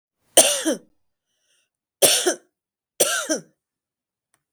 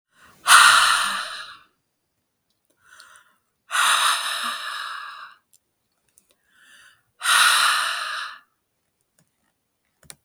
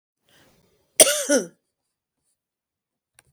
{"three_cough_length": "4.5 s", "three_cough_amplitude": 32768, "three_cough_signal_mean_std_ratio": 0.33, "exhalation_length": "10.2 s", "exhalation_amplitude": 32768, "exhalation_signal_mean_std_ratio": 0.4, "cough_length": "3.3 s", "cough_amplitude": 32768, "cough_signal_mean_std_ratio": 0.22, "survey_phase": "beta (2021-08-13 to 2022-03-07)", "age": "45-64", "gender": "Female", "wearing_mask": "No", "symptom_none": true, "smoker_status": "Current smoker (1 to 10 cigarettes per day)", "respiratory_condition_asthma": false, "respiratory_condition_other": false, "recruitment_source": "REACT", "submission_delay": "1 day", "covid_test_result": "Negative", "covid_test_method": "RT-qPCR", "influenza_a_test_result": "Unknown/Void", "influenza_b_test_result": "Unknown/Void"}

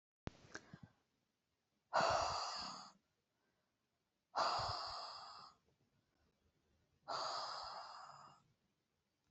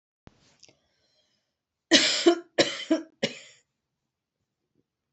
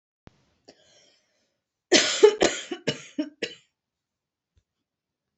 {"exhalation_length": "9.3 s", "exhalation_amplitude": 2553, "exhalation_signal_mean_std_ratio": 0.42, "three_cough_length": "5.1 s", "three_cough_amplitude": 26286, "three_cough_signal_mean_std_ratio": 0.28, "cough_length": "5.4 s", "cough_amplitude": 25962, "cough_signal_mean_std_ratio": 0.26, "survey_phase": "alpha (2021-03-01 to 2021-08-12)", "age": "45-64", "gender": "Female", "wearing_mask": "No", "symptom_none": true, "smoker_status": "Current smoker (e-cigarettes or vapes only)", "respiratory_condition_asthma": false, "respiratory_condition_other": false, "recruitment_source": "REACT", "submission_delay": "2 days", "covid_test_result": "Negative", "covid_test_method": "RT-qPCR"}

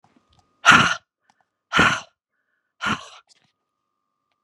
{"exhalation_length": "4.4 s", "exhalation_amplitude": 32768, "exhalation_signal_mean_std_ratio": 0.29, "survey_phase": "beta (2021-08-13 to 2022-03-07)", "age": "45-64", "gender": "Female", "wearing_mask": "No", "symptom_fatigue": true, "symptom_onset": "12 days", "smoker_status": "Never smoked", "respiratory_condition_asthma": false, "respiratory_condition_other": false, "recruitment_source": "REACT", "submission_delay": "1 day", "covid_test_result": "Negative", "covid_test_method": "RT-qPCR", "influenza_a_test_result": "Negative", "influenza_b_test_result": "Negative"}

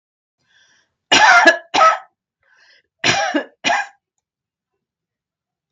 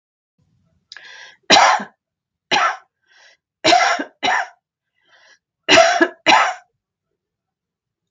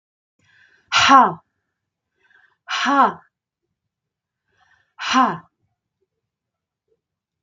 {"cough_length": "5.7 s", "cough_amplitude": 32768, "cough_signal_mean_std_ratio": 0.36, "three_cough_length": "8.1 s", "three_cough_amplitude": 32768, "three_cough_signal_mean_std_ratio": 0.37, "exhalation_length": "7.4 s", "exhalation_amplitude": 32768, "exhalation_signal_mean_std_ratio": 0.29, "survey_phase": "beta (2021-08-13 to 2022-03-07)", "age": "65+", "gender": "Female", "wearing_mask": "No", "symptom_none": true, "smoker_status": "Ex-smoker", "respiratory_condition_asthma": false, "respiratory_condition_other": false, "recruitment_source": "Test and Trace", "submission_delay": "-1 day", "covid_test_result": "Negative", "covid_test_method": "LFT"}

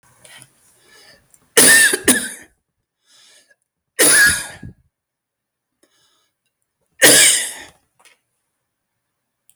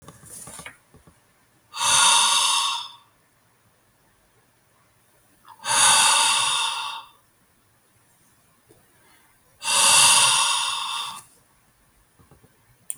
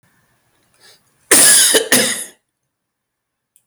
{"three_cough_length": "9.6 s", "three_cough_amplitude": 32768, "three_cough_signal_mean_std_ratio": 0.34, "exhalation_length": "13.0 s", "exhalation_amplitude": 25158, "exhalation_signal_mean_std_ratio": 0.45, "cough_length": "3.7 s", "cough_amplitude": 32768, "cough_signal_mean_std_ratio": 0.4, "survey_phase": "beta (2021-08-13 to 2022-03-07)", "age": "65+", "gender": "Male", "wearing_mask": "No", "symptom_runny_or_blocked_nose": true, "symptom_headache": true, "symptom_onset": "13 days", "smoker_status": "Ex-smoker", "respiratory_condition_asthma": false, "respiratory_condition_other": false, "recruitment_source": "REACT", "submission_delay": "0 days", "covid_test_result": "Negative", "covid_test_method": "RT-qPCR"}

